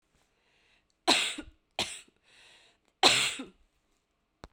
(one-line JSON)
{"three_cough_length": "4.5 s", "three_cough_amplitude": 17639, "three_cough_signal_mean_std_ratio": 0.3, "survey_phase": "beta (2021-08-13 to 2022-03-07)", "age": "45-64", "gender": "Female", "wearing_mask": "No", "symptom_cough_any": true, "symptom_new_continuous_cough": true, "symptom_runny_or_blocked_nose": true, "symptom_shortness_of_breath": true, "symptom_sore_throat": true, "symptom_fatigue": true, "symptom_headache": true, "symptom_change_to_sense_of_smell_or_taste": true, "symptom_loss_of_taste": true, "symptom_onset": "3 days", "smoker_status": "Never smoked", "respiratory_condition_asthma": true, "respiratory_condition_other": false, "recruitment_source": "Test and Trace", "submission_delay": "2 days", "covid_test_result": "Positive", "covid_test_method": "RT-qPCR", "covid_ct_value": 19.4, "covid_ct_gene": "ORF1ab gene", "covid_ct_mean": 20.1, "covid_viral_load": "260000 copies/ml", "covid_viral_load_category": "Low viral load (10K-1M copies/ml)"}